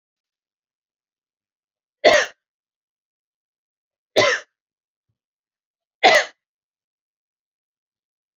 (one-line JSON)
{"three_cough_length": "8.4 s", "three_cough_amplitude": 31726, "three_cough_signal_mean_std_ratio": 0.21, "survey_phase": "alpha (2021-03-01 to 2021-08-12)", "age": "45-64", "gender": "Female", "wearing_mask": "No", "symptom_none": true, "smoker_status": "Never smoked", "respiratory_condition_asthma": false, "respiratory_condition_other": false, "recruitment_source": "REACT", "submission_delay": "7 days", "covid_test_result": "Negative", "covid_test_method": "RT-qPCR"}